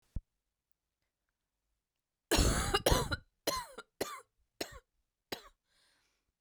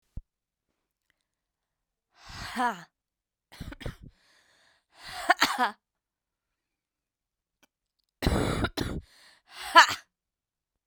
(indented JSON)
{
  "cough_length": "6.4 s",
  "cough_amplitude": 7700,
  "cough_signal_mean_std_ratio": 0.32,
  "exhalation_length": "10.9 s",
  "exhalation_amplitude": 27526,
  "exhalation_signal_mean_std_ratio": 0.25,
  "survey_phase": "beta (2021-08-13 to 2022-03-07)",
  "age": "18-44",
  "gender": "Female",
  "wearing_mask": "No",
  "symptom_cough_any": true,
  "symptom_runny_or_blocked_nose": true,
  "symptom_shortness_of_breath": true,
  "symptom_sore_throat": true,
  "symptom_abdominal_pain": true,
  "symptom_fatigue": true,
  "symptom_fever_high_temperature": true,
  "symptom_headache": true,
  "symptom_change_to_sense_of_smell_or_taste": true,
  "symptom_onset": "3 days",
  "smoker_status": "Never smoked",
  "respiratory_condition_asthma": true,
  "respiratory_condition_other": false,
  "recruitment_source": "Test and Trace",
  "submission_delay": "2 days",
  "covid_test_result": "Positive",
  "covid_test_method": "RT-qPCR"
}